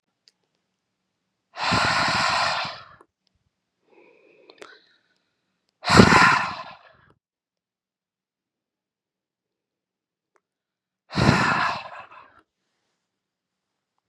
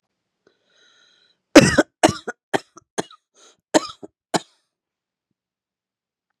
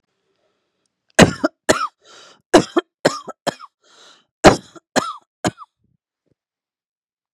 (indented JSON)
{
  "exhalation_length": "14.1 s",
  "exhalation_amplitude": 32768,
  "exhalation_signal_mean_std_ratio": 0.31,
  "cough_length": "6.4 s",
  "cough_amplitude": 32768,
  "cough_signal_mean_std_ratio": 0.19,
  "three_cough_length": "7.3 s",
  "three_cough_amplitude": 32768,
  "three_cough_signal_mean_std_ratio": 0.24,
  "survey_phase": "beta (2021-08-13 to 2022-03-07)",
  "age": "45-64",
  "gender": "Female",
  "wearing_mask": "No",
  "symptom_runny_or_blocked_nose": true,
  "symptom_abdominal_pain": true,
  "symptom_fatigue": true,
  "symptom_headache": true,
  "symptom_other": true,
  "symptom_onset": "3 days",
  "smoker_status": "Current smoker (e-cigarettes or vapes only)",
  "respiratory_condition_asthma": false,
  "respiratory_condition_other": false,
  "recruitment_source": "Test and Trace",
  "submission_delay": "2 days",
  "covid_test_result": "Positive",
  "covid_test_method": "RT-qPCR",
  "covid_ct_value": 23.6,
  "covid_ct_gene": "ORF1ab gene",
  "covid_ct_mean": 24.1,
  "covid_viral_load": "12000 copies/ml",
  "covid_viral_load_category": "Low viral load (10K-1M copies/ml)"
}